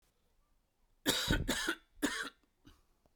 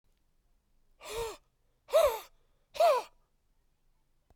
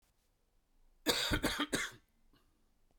{"three_cough_length": "3.2 s", "three_cough_amplitude": 5500, "three_cough_signal_mean_std_ratio": 0.44, "exhalation_length": "4.4 s", "exhalation_amplitude": 5935, "exhalation_signal_mean_std_ratio": 0.32, "cough_length": "3.0 s", "cough_amplitude": 4505, "cough_signal_mean_std_ratio": 0.41, "survey_phase": "beta (2021-08-13 to 2022-03-07)", "age": "45-64", "gender": "Male", "wearing_mask": "No", "symptom_cough_any": true, "symptom_runny_or_blocked_nose": true, "symptom_fatigue": true, "symptom_fever_high_temperature": true, "symptom_headache": true, "symptom_change_to_sense_of_smell_or_taste": true, "smoker_status": "Never smoked", "respiratory_condition_asthma": true, "respiratory_condition_other": false, "recruitment_source": "Test and Trace", "submission_delay": "2 days", "covid_test_result": "Positive", "covid_test_method": "RT-qPCR", "covid_ct_value": 15.4, "covid_ct_gene": "ORF1ab gene", "covid_ct_mean": 15.8, "covid_viral_load": "6700000 copies/ml", "covid_viral_load_category": "High viral load (>1M copies/ml)"}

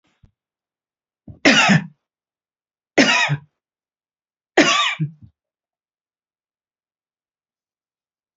{"three_cough_length": "8.4 s", "three_cough_amplitude": 29618, "three_cough_signal_mean_std_ratio": 0.3, "survey_phase": "beta (2021-08-13 to 2022-03-07)", "age": "65+", "gender": "Female", "wearing_mask": "No", "symptom_cough_any": true, "smoker_status": "Ex-smoker", "respiratory_condition_asthma": true, "respiratory_condition_other": false, "recruitment_source": "REACT", "submission_delay": "1 day", "covid_test_result": "Negative", "covid_test_method": "RT-qPCR", "influenza_a_test_result": "Negative", "influenza_b_test_result": "Negative"}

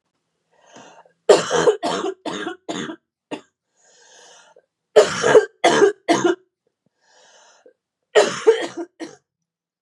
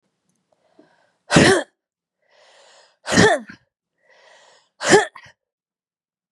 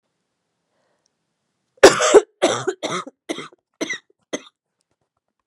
{"three_cough_length": "9.8 s", "three_cough_amplitude": 32768, "three_cough_signal_mean_std_ratio": 0.37, "exhalation_length": "6.3 s", "exhalation_amplitude": 32707, "exhalation_signal_mean_std_ratio": 0.29, "cough_length": "5.5 s", "cough_amplitude": 32768, "cough_signal_mean_std_ratio": 0.26, "survey_phase": "beta (2021-08-13 to 2022-03-07)", "age": "18-44", "gender": "Female", "wearing_mask": "No", "symptom_cough_any": true, "symptom_runny_or_blocked_nose": true, "symptom_sore_throat": true, "symptom_fatigue": true, "symptom_headache": true, "smoker_status": "Ex-smoker", "respiratory_condition_asthma": true, "respiratory_condition_other": false, "recruitment_source": "Test and Trace", "submission_delay": "1 day", "covid_test_result": "Positive", "covid_test_method": "ePCR"}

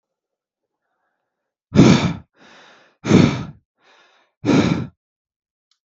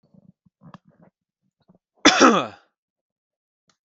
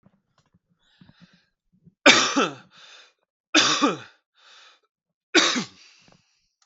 {"exhalation_length": "5.9 s", "exhalation_amplitude": 32768, "exhalation_signal_mean_std_ratio": 0.33, "cough_length": "3.8 s", "cough_amplitude": 32768, "cough_signal_mean_std_ratio": 0.24, "three_cough_length": "6.7 s", "three_cough_amplitude": 32768, "three_cough_signal_mean_std_ratio": 0.31, "survey_phase": "beta (2021-08-13 to 2022-03-07)", "age": "18-44", "gender": "Male", "wearing_mask": "No", "symptom_none": true, "smoker_status": "Ex-smoker", "respiratory_condition_asthma": true, "respiratory_condition_other": false, "recruitment_source": "REACT", "submission_delay": "0 days", "covid_test_result": "Negative", "covid_test_method": "RT-qPCR", "influenza_a_test_result": "Negative", "influenza_b_test_result": "Negative"}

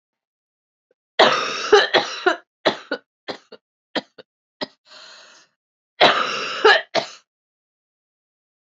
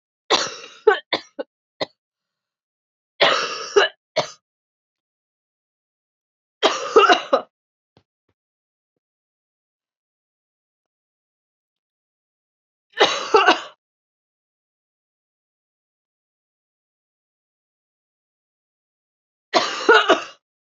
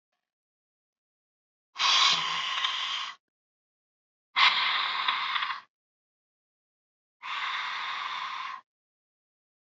{"cough_length": "8.6 s", "cough_amplitude": 30443, "cough_signal_mean_std_ratio": 0.34, "three_cough_length": "20.7 s", "three_cough_amplitude": 30418, "three_cough_signal_mean_std_ratio": 0.25, "exhalation_length": "9.7 s", "exhalation_amplitude": 12176, "exhalation_signal_mean_std_ratio": 0.47, "survey_phase": "beta (2021-08-13 to 2022-03-07)", "age": "18-44", "gender": "Female", "wearing_mask": "No", "symptom_cough_any": true, "symptom_new_continuous_cough": true, "symptom_runny_or_blocked_nose": true, "symptom_headache": true, "symptom_onset": "4 days", "smoker_status": "Never smoked", "respiratory_condition_asthma": false, "respiratory_condition_other": false, "recruitment_source": "Test and Trace", "submission_delay": "1 day", "covid_test_result": "Positive", "covid_test_method": "RT-qPCR", "covid_ct_value": 19.2, "covid_ct_gene": "ORF1ab gene", "covid_ct_mean": 19.6, "covid_viral_load": "370000 copies/ml", "covid_viral_load_category": "Low viral load (10K-1M copies/ml)"}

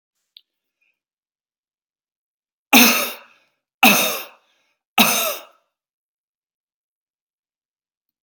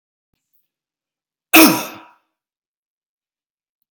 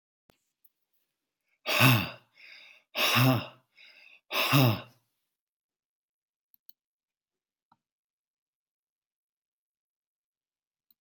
{"three_cough_length": "8.2 s", "three_cough_amplitude": 32768, "three_cough_signal_mean_std_ratio": 0.26, "cough_length": "3.9 s", "cough_amplitude": 32768, "cough_signal_mean_std_ratio": 0.21, "exhalation_length": "11.0 s", "exhalation_amplitude": 12221, "exhalation_signal_mean_std_ratio": 0.28, "survey_phase": "beta (2021-08-13 to 2022-03-07)", "age": "45-64", "gender": "Male", "wearing_mask": "No", "symptom_none": true, "smoker_status": "Ex-smoker", "respiratory_condition_asthma": false, "respiratory_condition_other": false, "recruitment_source": "REACT", "submission_delay": "1 day", "covid_test_result": "Negative", "covid_test_method": "RT-qPCR", "influenza_a_test_result": "Negative", "influenza_b_test_result": "Negative"}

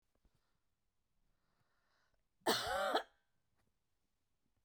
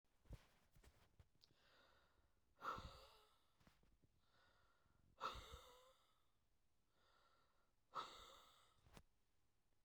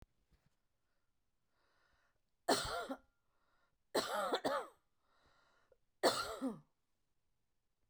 {"cough_length": "4.6 s", "cough_amplitude": 3314, "cough_signal_mean_std_ratio": 0.28, "exhalation_length": "9.8 s", "exhalation_amplitude": 514, "exhalation_signal_mean_std_ratio": 0.39, "three_cough_length": "7.9 s", "three_cough_amplitude": 4183, "three_cough_signal_mean_std_ratio": 0.33, "survey_phase": "beta (2021-08-13 to 2022-03-07)", "age": "45-64", "gender": "Female", "wearing_mask": "No", "symptom_none": true, "smoker_status": "Ex-smoker", "respiratory_condition_asthma": false, "respiratory_condition_other": false, "recruitment_source": "REACT", "submission_delay": "1 day", "covid_test_result": "Negative", "covid_test_method": "RT-qPCR"}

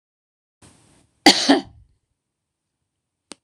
{"cough_length": "3.4 s", "cough_amplitude": 26028, "cough_signal_mean_std_ratio": 0.22, "survey_phase": "beta (2021-08-13 to 2022-03-07)", "age": "45-64", "gender": "Female", "wearing_mask": "No", "symptom_cough_any": true, "symptom_fatigue": true, "symptom_onset": "8 days", "smoker_status": "Never smoked", "respiratory_condition_asthma": false, "respiratory_condition_other": false, "recruitment_source": "REACT", "submission_delay": "1 day", "covid_test_result": "Negative", "covid_test_method": "RT-qPCR"}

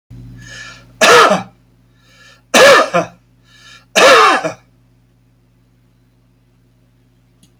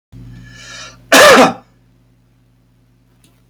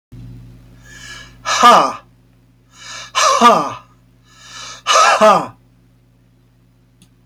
{"three_cough_length": "7.6 s", "three_cough_amplitude": 32768, "three_cough_signal_mean_std_ratio": 0.38, "cough_length": "3.5 s", "cough_amplitude": 32768, "cough_signal_mean_std_ratio": 0.34, "exhalation_length": "7.3 s", "exhalation_amplitude": 32458, "exhalation_signal_mean_std_ratio": 0.41, "survey_phase": "beta (2021-08-13 to 2022-03-07)", "age": "65+", "gender": "Male", "wearing_mask": "No", "symptom_none": true, "smoker_status": "Ex-smoker", "respiratory_condition_asthma": false, "respiratory_condition_other": false, "recruitment_source": "REACT", "submission_delay": "1 day", "covid_test_result": "Negative", "covid_test_method": "RT-qPCR", "influenza_a_test_result": "Negative", "influenza_b_test_result": "Negative"}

